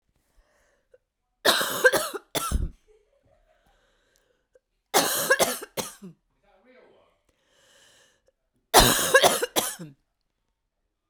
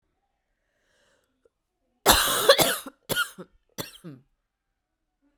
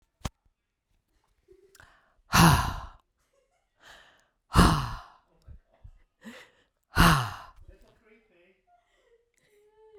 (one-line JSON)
{"three_cough_length": "11.1 s", "three_cough_amplitude": 32767, "three_cough_signal_mean_std_ratio": 0.33, "cough_length": "5.4 s", "cough_amplitude": 25881, "cough_signal_mean_std_ratio": 0.3, "exhalation_length": "10.0 s", "exhalation_amplitude": 22085, "exhalation_signal_mean_std_ratio": 0.27, "survey_phase": "beta (2021-08-13 to 2022-03-07)", "age": "18-44", "gender": "Female", "wearing_mask": "No", "symptom_cough_any": true, "symptom_runny_or_blocked_nose": true, "symptom_fatigue": true, "symptom_headache": true, "symptom_change_to_sense_of_smell_or_taste": true, "symptom_loss_of_taste": true, "symptom_onset": "4 days", "smoker_status": "Never smoked", "respiratory_condition_asthma": false, "respiratory_condition_other": false, "recruitment_source": "Test and Trace", "submission_delay": "2 days", "covid_test_result": "Positive", "covid_test_method": "RT-qPCR", "covid_ct_value": 17.6, "covid_ct_gene": "ORF1ab gene", "covid_ct_mean": 19.0, "covid_viral_load": "590000 copies/ml", "covid_viral_load_category": "Low viral load (10K-1M copies/ml)"}